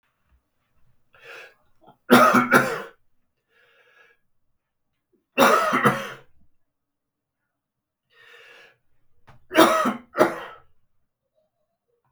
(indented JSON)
{
  "three_cough_length": "12.1 s",
  "three_cough_amplitude": 32766,
  "three_cough_signal_mean_std_ratio": 0.31,
  "survey_phase": "beta (2021-08-13 to 2022-03-07)",
  "age": "45-64",
  "gender": "Male",
  "wearing_mask": "No",
  "symptom_cough_any": true,
  "symptom_runny_or_blocked_nose": true,
  "symptom_sore_throat": true,
  "symptom_fatigue": true,
  "symptom_headache": true,
  "symptom_onset": "3 days",
  "smoker_status": "Ex-smoker",
  "respiratory_condition_asthma": false,
  "respiratory_condition_other": false,
  "recruitment_source": "Test and Trace",
  "submission_delay": "2 days",
  "covid_test_result": "Positive",
  "covid_test_method": "RT-qPCR",
  "covid_ct_value": 22.1,
  "covid_ct_gene": "N gene"
}